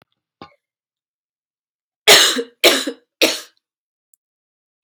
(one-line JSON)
{"cough_length": "4.8 s", "cough_amplitude": 32768, "cough_signal_mean_std_ratio": 0.28, "survey_phase": "alpha (2021-03-01 to 2021-08-12)", "age": "45-64", "gender": "Female", "wearing_mask": "No", "symptom_fatigue": true, "symptom_change_to_sense_of_smell_or_taste": true, "symptom_onset": "4 days", "smoker_status": "Never smoked", "respiratory_condition_asthma": false, "respiratory_condition_other": false, "recruitment_source": "Test and Trace", "submission_delay": "3 days", "covid_test_result": "Positive", "covid_test_method": "RT-qPCR", "covid_ct_value": 21.0, "covid_ct_gene": "ORF1ab gene", "covid_ct_mean": 21.6, "covid_viral_load": "83000 copies/ml", "covid_viral_load_category": "Low viral load (10K-1M copies/ml)"}